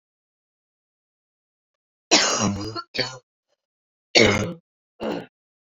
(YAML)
cough_length: 5.6 s
cough_amplitude: 29198
cough_signal_mean_std_ratio: 0.34
survey_phase: beta (2021-08-13 to 2022-03-07)
age: 45-64
gender: Female
wearing_mask: 'No'
symptom_cough_any: true
symptom_new_continuous_cough: true
symptom_runny_or_blocked_nose: true
symptom_sore_throat: true
symptom_fatigue: true
symptom_fever_high_temperature: true
symptom_headache: true
symptom_change_to_sense_of_smell_or_taste: true
symptom_onset: 5 days
smoker_status: Never smoked
respiratory_condition_asthma: false
respiratory_condition_other: false
recruitment_source: Test and Trace
submission_delay: 2 days
covid_test_result: Positive
covid_test_method: RT-qPCR
covid_ct_value: 14.5
covid_ct_gene: ORF1ab gene
covid_ct_mean: 15.0
covid_viral_load: 12000000 copies/ml
covid_viral_load_category: High viral load (>1M copies/ml)